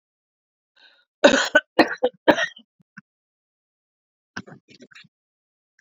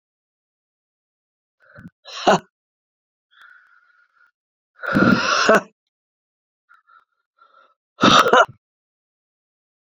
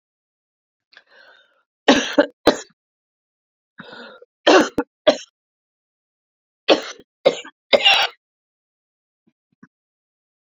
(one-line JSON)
{"cough_length": "5.8 s", "cough_amplitude": 28722, "cough_signal_mean_std_ratio": 0.24, "exhalation_length": "9.8 s", "exhalation_amplitude": 32768, "exhalation_signal_mean_std_ratio": 0.28, "three_cough_length": "10.4 s", "three_cough_amplitude": 32183, "three_cough_signal_mean_std_ratio": 0.26, "survey_phase": "beta (2021-08-13 to 2022-03-07)", "age": "45-64", "gender": "Female", "wearing_mask": "No", "symptom_cough_any": true, "symptom_runny_or_blocked_nose": true, "symptom_sore_throat": true, "symptom_fatigue": true, "symptom_loss_of_taste": true, "smoker_status": "Ex-smoker", "respiratory_condition_asthma": true, "respiratory_condition_other": false, "recruitment_source": "Test and Trace", "submission_delay": "2 days", "covid_test_result": "Positive", "covid_test_method": "RT-qPCR", "covid_ct_value": 28.4, "covid_ct_gene": "ORF1ab gene"}